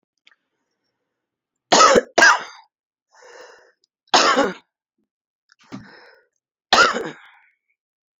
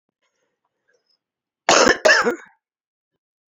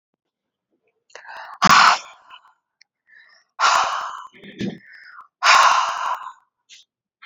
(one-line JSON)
{"three_cough_length": "8.2 s", "three_cough_amplitude": 29028, "three_cough_signal_mean_std_ratio": 0.31, "cough_length": "3.5 s", "cough_amplitude": 29679, "cough_signal_mean_std_ratio": 0.31, "exhalation_length": "7.3 s", "exhalation_amplitude": 29250, "exhalation_signal_mean_std_ratio": 0.38, "survey_phase": "alpha (2021-03-01 to 2021-08-12)", "age": "45-64", "gender": "Female", "wearing_mask": "No", "symptom_cough_any": true, "symptom_shortness_of_breath": true, "symptom_fatigue": true, "symptom_headache": true, "symptom_onset": "3 days", "smoker_status": "Never smoked", "respiratory_condition_asthma": true, "respiratory_condition_other": false, "recruitment_source": "Test and Trace", "submission_delay": "2 days", "covid_test_result": "Positive", "covid_test_method": "RT-qPCR", "covid_ct_value": 14.5, "covid_ct_gene": "N gene", "covid_ct_mean": 14.7, "covid_viral_load": "15000000 copies/ml", "covid_viral_load_category": "High viral load (>1M copies/ml)"}